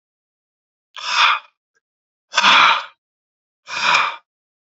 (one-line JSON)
{"exhalation_length": "4.7 s", "exhalation_amplitude": 30885, "exhalation_signal_mean_std_ratio": 0.4, "survey_phase": "beta (2021-08-13 to 2022-03-07)", "age": "18-44", "gender": "Male", "wearing_mask": "No", "symptom_cough_any": true, "symptom_runny_or_blocked_nose": true, "symptom_fatigue": true, "smoker_status": "Never smoked", "respiratory_condition_asthma": false, "respiratory_condition_other": false, "recruitment_source": "Test and Trace", "submission_delay": "0 days", "covid_test_result": "Positive", "covid_test_method": "LFT"}